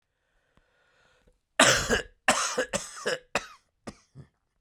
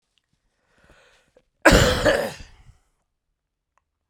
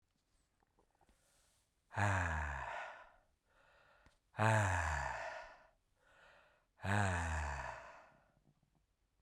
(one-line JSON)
{"three_cough_length": "4.6 s", "three_cough_amplitude": 24061, "three_cough_signal_mean_std_ratio": 0.36, "cough_length": "4.1 s", "cough_amplitude": 32767, "cough_signal_mean_std_ratio": 0.29, "exhalation_length": "9.2 s", "exhalation_amplitude": 3330, "exhalation_signal_mean_std_ratio": 0.47, "survey_phase": "beta (2021-08-13 to 2022-03-07)", "age": "45-64", "gender": "Male", "wearing_mask": "No", "symptom_cough_any": true, "symptom_runny_or_blocked_nose": true, "symptom_fever_high_temperature": true, "symptom_headache": true, "symptom_onset": "4 days", "smoker_status": "Never smoked", "respiratory_condition_asthma": false, "respiratory_condition_other": false, "recruitment_source": "Test and Trace", "submission_delay": "2 days", "covid_test_result": "Positive", "covid_test_method": "RT-qPCR", "covid_ct_value": 21.9, "covid_ct_gene": "ORF1ab gene", "covid_ct_mean": 22.6, "covid_viral_load": "38000 copies/ml", "covid_viral_load_category": "Low viral load (10K-1M copies/ml)"}